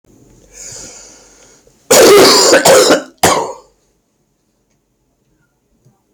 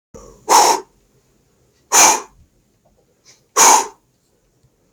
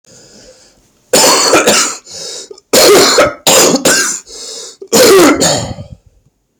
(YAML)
cough_length: 6.1 s
cough_amplitude: 32768
cough_signal_mean_std_ratio: 0.44
exhalation_length: 4.9 s
exhalation_amplitude: 31021
exhalation_signal_mean_std_ratio: 0.35
three_cough_length: 6.6 s
three_cough_amplitude: 32768
three_cough_signal_mean_std_ratio: 0.67
survey_phase: beta (2021-08-13 to 2022-03-07)
age: 18-44
gender: Male
wearing_mask: 'No'
symptom_cough_any: true
symptom_sore_throat: true
symptom_onset: 3 days
smoker_status: Never smoked
respiratory_condition_asthma: true
respiratory_condition_other: false
recruitment_source: Test and Trace
submission_delay: 2 days
covid_test_result: Positive
covid_test_method: RT-qPCR
covid_ct_value: 22.3
covid_ct_gene: ORF1ab gene
covid_ct_mean: 22.7
covid_viral_load: 36000 copies/ml
covid_viral_load_category: Low viral load (10K-1M copies/ml)